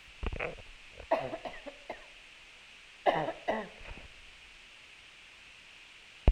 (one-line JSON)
{"cough_length": "6.3 s", "cough_amplitude": 13020, "cough_signal_mean_std_ratio": 0.37, "survey_phase": "alpha (2021-03-01 to 2021-08-12)", "age": "45-64", "gender": "Female", "wearing_mask": "No", "symptom_none": true, "smoker_status": "Never smoked", "respiratory_condition_asthma": false, "respiratory_condition_other": false, "recruitment_source": "REACT", "submission_delay": "2 days", "covid_test_result": "Negative", "covid_test_method": "RT-qPCR"}